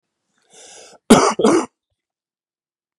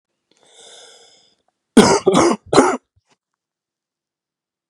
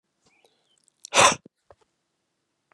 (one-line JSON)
{"cough_length": "3.0 s", "cough_amplitude": 32768, "cough_signal_mean_std_ratio": 0.31, "three_cough_length": "4.7 s", "three_cough_amplitude": 32768, "three_cough_signal_mean_std_ratio": 0.31, "exhalation_length": "2.7 s", "exhalation_amplitude": 24566, "exhalation_signal_mean_std_ratio": 0.21, "survey_phase": "beta (2021-08-13 to 2022-03-07)", "age": "45-64", "gender": "Male", "wearing_mask": "No", "symptom_cough_any": true, "symptom_onset": "5 days", "smoker_status": "Never smoked", "respiratory_condition_asthma": false, "respiratory_condition_other": false, "recruitment_source": "Test and Trace", "submission_delay": "1 day", "covid_test_result": "Positive", "covid_test_method": "RT-qPCR", "covid_ct_value": 21.8, "covid_ct_gene": "ORF1ab gene", "covid_ct_mean": 21.9, "covid_viral_load": "65000 copies/ml", "covid_viral_load_category": "Low viral load (10K-1M copies/ml)"}